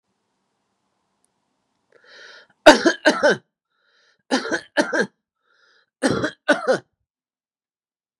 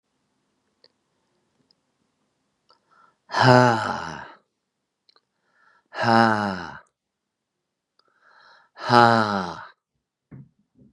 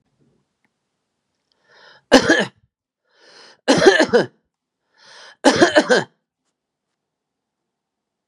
three_cough_length: 8.2 s
three_cough_amplitude: 32768
three_cough_signal_mean_std_ratio: 0.29
exhalation_length: 10.9 s
exhalation_amplitude: 32561
exhalation_signal_mean_std_ratio: 0.28
cough_length: 8.3 s
cough_amplitude: 32768
cough_signal_mean_std_ratio: 0.3
survey_phase: beta (2021-08-13 to 2022-03-07)
age: 45-64
gender: Male
wearing_mask: 'No'
symptom_fatigue: true
smoker_status: Never smoked
respiratory_condition_asthma: false
respiratory_condition_other: false
recruitment_source: REACT
submission_delay: 0 days
covid_test_result: Negative
covid_test_method: RT-qPCR
influenza_a_test_result: Negative
influenza_b_test_result: Negative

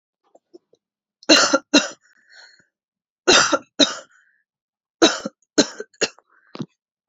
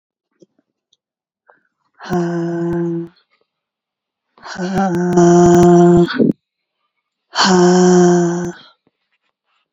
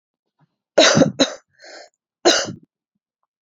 three_cough_length: 7.1 s
three_cough_amplitude: 32767
three_cough_signal_mean_std_ratio: 0.3
exhalation_length: 9.7 s
exhalation_amplitude: 28761
exhalation_signal_mean_std_ratio: 0.53
cough_length: 3.4 s
cough_amplitude: 29992
cough_signal_mean_std_ratio: 0.34
survey_phase: beta (2021-08-13 to 2022-03-07)
age: 45-64
gender: Female
wearing_mask: 'No'
symptom_cough_any: true
symptom_sore_throat: true
symptom_abdominal_pain: true
symptom_fatigue: true
symptom_fever_high_temperature: true
symptom_change_to_sense_of_smell_or_taste: true
smoker_status: Never smoked
respiratory_condition_asthma: false
respiratory_condition_other: false
recruitment_source: Test and Trace
submission_delay: 1 day
covid_test_result: Positive
covid_test_method: RT-qPCR
covid_ct_value: 23.7
covid_ct_gene: ORF1ab gene
covid_ct_mean: 24.0
covid_viral_load: 14000 copies/ml
covid_viral_load_category: Low viral load (10K-1M copies/ml)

